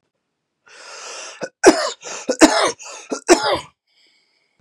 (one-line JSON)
{"three_cough_length": "4.6 s", "three_cough_amplitude": 32768, "three_cough_signal_mean_std_ratio": 0.35, "survey_phase": "beta (2021-08-13 to 2022-03-07)", "age": "18-44", "gender": "Male", "wearing_mask": "No", "symptom_cough_any": true, "symptom_runny_or_blocked_nose": true, "symptom_fatigue": true, "symptom_headache": true, "symptom_other": true, "symptom_onset": "3 days", "smoker_status": "Never smoked", "respiratory_condition_asthma": true, "respiratory_condition_other": false, "recruitment_source": "Test and Trace", "submission_delay": "2 days", "covid_test_result": "Positive", "covid_test_method": "ePCR"}